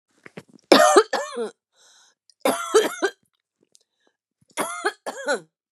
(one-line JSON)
{"three_cough_length": "5.7 s", "three_cough_amplitude": 32412, "three_cough_signal_mean_std_ratio": 0.36, "survey_phase": "beta (2021-08-13 to 2022-03-07)", "age": "45-64", "gender": "Female", "wearing_mask": "No", "symptom_none": true, "symptom_onset": "12 days", "smoker_status": "Ex-smoker", "respiratory_condition_asthma": false, "respiratory_condition_other": false, "recruitment_source": "REACT", "submission_delay": "4 days", "covid_test_result": "Negative", "covid_test_method": "RT-qPCR", "influenza_a_test_result": "Negative", "influenza_b_test_result": "Negative"}